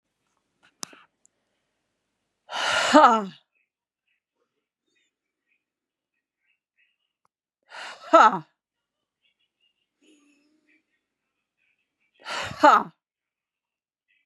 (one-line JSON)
{"exhalation_length": "14.3 s", "exhalation_amplitude": 29847, "exhalation_signal_mean_std_ratio": 0.21, "survey_phase": "beta (2021-08-13 to 2022-03-07)", "age": "18-44", "gender": "Female", "wearing_mask": "No", "symptom_runny_or_blocked_nose": true, "symptom_headache": true, "symptom_onset": "3 days", "smoker_status": "Never smoked", "respiratory_condition_asthma": true, "respiratory_condition_other": false, "recruitment_source": "REACT", "submission_delay": "1 day", "covid_test_result": "Positive", "covid_test_method": "RT-qPCR", "covid_ct_value": 18.0, "covid_ct_gene": "E gene", "influenza_a_test_result": "Negative", "influenza_b_test_result": "Negative"}